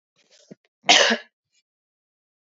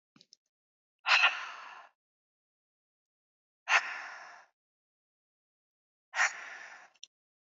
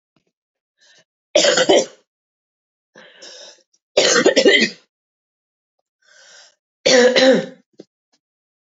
{"cough_length": "2.6 s", "cough_amplitude": 31914, "cough_signal_mean_std_ratio": 0.26, "exhalation_length": "7.5 s", "exhalation_amplitude": 9137, "exhalation_signal_mean_std_ratio": 0.27, "three_cough_length": "8.7 s", "three_cough_amplitude": 32735, "three_cough_signal_mean_std_ratio": 0.37, "survey_phase": "beta (2021-08-13 to 2022-03-07)", "age": "45-64", "gender": "Female", "wearing_mask": "No", "symptom_cough_any": true, "symptom_runny_or_blocked_nose": true, "symptom_headache": true, "symptom_onset": "3 days", "smoker_status": "Never smoked", "respiratory_condition_asthma": false, "respiratory_condition_other": false, "recruitment_source": "Test and Trace", "submission_delay": "1 day", "covid_test_result": "Positive", "covid_test_method": "RT-qPCR", "covid_ct_value": 20.1, "covid_ct_gene": "ORF1ab gene"}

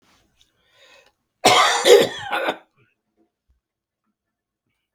{"cough_length": "4.9 s", "cough_amplitude": 32768, "cough_signal_mean_std_ratio": 0.31, "survey_phase": "beta (2021-08-13 to 2022-03-07)", "age": "65+", "gender": "Male", "wearing_mask": "No", "symptom_cough_any": true, "smoker_status": "Never smoked", "respiratory_condition_asthma": false, "respiratory_condition_other": false, "recruitment_source": "REACT", "submission_delay": "2 days", "covid_test_result": "Negative", "covid_test_method": "RT-qPCR", "influenza_a_test_result": "Negative", "influenza_b_test_result": "Negative"}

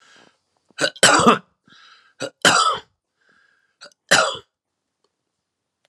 {"three_cough_length": "5.9 s", "three_cough_amplitude": 32767, "three_cough_signal_mean_std_ratio": 0.32, "survey_phase": "beta (2021-08-13 to 2022-03-07)", "age": "65+", "gender": "Male", "wearing_mask": "No", "symptom_none": true, "smoker_status": "Ex-smoker", "respiratory_condition_asthma": false, "respiratory_condition_other": false, "recruitment_source": "Test and Trace", "submission_delay": "2 days", "covid_test_result": "Negative", "covid_test_method": "RT-qPCR"}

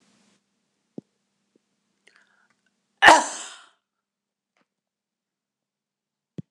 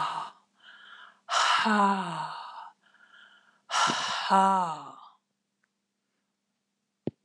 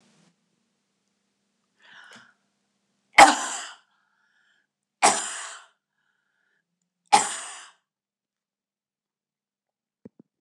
{"cough_length": "6.5 s", "cough_amplitude": 26028, "cough_signal_mean_std_ratio": 0.15, "exhalation_length": "7.2 s", "exhalation_amplitude": 12900, "exhalation_signal_mean_std_ratio": 0.47, "three_cough_length": "10.4 s", "three_cough_amplitude": 26028, "three_cough_signal_mean_std_ratio": 0.18, "survey_phase": "beta (2021-08-13 to 2022-03-07)", "age": "65+", "gender": "Female", "wearing_mask": "No", "symptom_none": true, "smoker_status": "Never smoked", "respiratory_condition_asthma": false, "respiratory_condition_other": false, "recruitment_source": "REACT", "submission_delay": "5 days", "covid_test_result": "Negative", "covid_test_method": "RT-qPCR", "influenza_a_test_result": "Unknown/Void", "influenza_b_test_result": "Unknown/Void"}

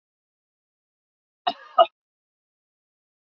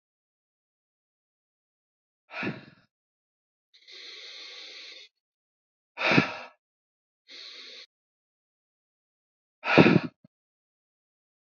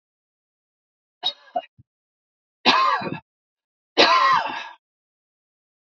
{"cough_length": "3.2 s", "cough_amplitude": 24887, "cough_signal_mean_std_ratio": 0.14, "exhalation_length": "11.5 s", "exhalation_amplitude": 24917, "exhalation_signal_mean_std_ratio": 0.21, "three_cough_length": "5.9 s", "three_cough_amplitude": 29585, "three_cough_signal_mean_std_ratio": 0.35, "survey_phase": "beta (2021-08-13 to 2022-03-07)", "age": "45-64", "gender": "Male", "wearing_mask": "No", "symptom_none": true, "smoker_status": "Never smoked", "respiratory_condition_asthma": false, "respiratory_condition_other": false, "recruitment_source": "Test and Trace", "submission_delay": "0 days", "covid_test_result": "Negative", "covid_test_method": "RT-qPCR"}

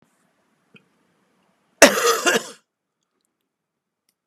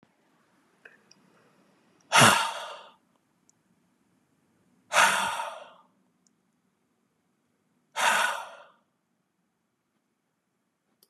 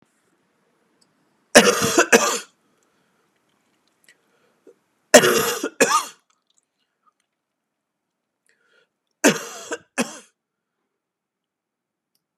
{"cough_length": "4.3 s", "cough_amplitude": 32768, "cough_signal_mean_std_ratio": 0.24, "exhalation_length": "11.1 s", "exhalation_amplitude": 22023, "exhalation_signal_mean_std_ratio": 0.27, "three_cough_length": "12.4 s", "three_cough_amplitude": 32768, "three_cough_signal_mean_std_ratio": 0.26, "survey_phase": "beta (2021-08-13 to 2022-03-07)", "age": "65+", "gender": "Male", "wearing_mask": "No", "symptom_sore_throat": true, "symptom_onset": "5 days", "smoker_status": "Never smoked", "respiratory_condition_asthma": false, "respiratory_condition_other": false, "recruitment_source": "Test and Trace", "submission_delay": "2 days", "covid_test_result": "Positive", "covid_test_method": "RT-qPCR", "covid_ct_value": 19.4, "covid_ct_gene": "ORF1ab gene", "covid_ct_mean": 19.7, "covid_viral_load": "340000 copies/ml", "covid_viral_load_category": "Low viral load (10K-1M copies/ml)"}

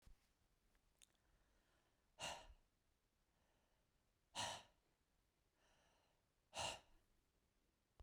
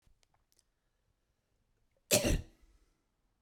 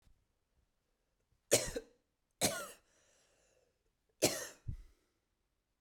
{"exhalation_length": "8.0 s", "exhalation_amplitude": 574, "exhalation_signal_mean_std_ratio": 0.3, "cough_length": "3.4 s", "cough_amplitude": 9047, "cough_signal_mean_std_ratio": 0.23, "three_cough_length": "5.8 s", "three_cough_amplitude": 8840, "three_cough_signal_mean_std_ratio": 0.26, "survey_phase": "beta (2021-08-13 to 2022-03-07)", "age": "18-44", "gender": "Female", "wearing_mask": "No", "symptom_none": true, "smoker_status": "Never smoked", "respiratory_condition_asthma": false, "respiratory_condition_other": false, "recruitment_source": "REACT", "submission_delay": "2 days", "covid_test_result": "Negative", "covid_test_method": "RT-qPCR"}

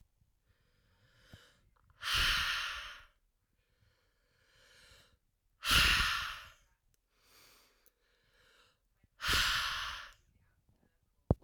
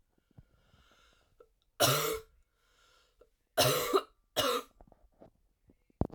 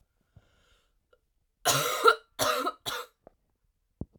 {"exhalation_length": "11.4 s", "exhalation_amplitude": 8592, "exhalation_signal_mean_std_ratio": 0.35, "three_cough_length": "6.1 s", "three_cough_amplitude": 7879, "three_cough_signal_mean_std_ratio": 0.34, "cough_length": "4.2 s", "cough_amplitude": 16090, "cough_signal_mean_std_ratio": 0.34, "survey_phase": "alpha (2021-03-01 to 2021-08-12)", "age": "18-44", "gender": "Female", "wearing_mask": "No", "symptom_cough_any": true, "symptom_new_continuous_cough": true, "symptom_fatigue": true, "symptom_headache": true, "symptom_change_to_sense_of_smell_or_taste": true, "symptom_loss_of_taste": true, "symptom_onset": "4 days", "smoker_status": "Never smoked", "respiratory_condition_asthma": false, "respiratory_condition_other": false, "recruitment_source": "Test and Trace", "submission_delay": "2 days", "covid_test_result": "Positive", "covid_test_method": "RT-qPCR", "covid_ct_value": 18.2, "covid_ct_gene": "ORF1ab gene", "covid_ct_mean": 18.7, "covid_viral_load": "750000 copies/ml", "covid_viral_load_category": "Low viral load (10K-1M copies/ml)"}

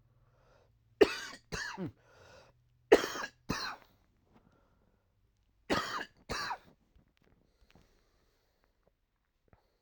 {"three_cough_length": "9.8 s", "three_cough_amplitude": 11973, "three_cough_signal_mean_std_ratio": 0.23, "survey_phase": "alpha (2021-03-01 to 2021-08-12)", "age": "18-44", "gender": "Male", "wearing_mask": "No", "symptom_none": true, "smoker_status": "Current smoker (11 or more cigarettes per day)", "respiratory_condition_asthma": false, "respiratory_condition_other": false, "recruitment_source": "REACT", "submission_delay": "1 day", "covid_test_result": "Negative", "covid_test_method": "RT-qPCR"}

